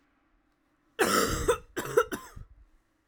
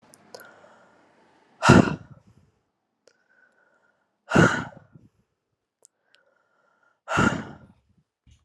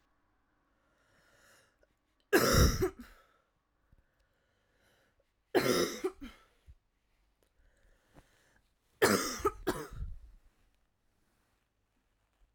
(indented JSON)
{
  "cough_length": "3.1 s",
  "cough_amplitude": 10237,
  "cough_signal_mean_std_ratio": 0.42,
  "exhalation_length": "8.4 s",
  "exhalation_amplitude": 31400,
  "exhalation_signal_mean_std_ratio": 0.24,
  "three_cough_length": "12.5 s",
  "three_cough_amplitude": 8056,
  "three_cough_signal_mean_std_ratio": 0.29,
  "survey_phase": "alpha (2021-03-01 to 2021-08-12)",
  "age": "18-44",
  "gender": "Female",
  "wearing_mask": "No",
  "symptom_new_continuous_cough": true,
  "symptom_fatigue": true,
  "symptom_fever_high_temperature": true,
  "symptom_headache": true,
  "symptom_change_to_sense_of_smell_or_taste": true,
  "symptom_loss_of_taste": true,
  "symptom_onset": "4 days",
  "smoker_status": "Never smoked",
  "respiratory_condition_asthma": false,
  "respiratory_condition_other": false,
  "recruitment_source": "Test and Trace",
  "submission_delay": "1 day",
  "covid_test_result": "Positive",
  "covid_test_method": "RT-qPCR"
}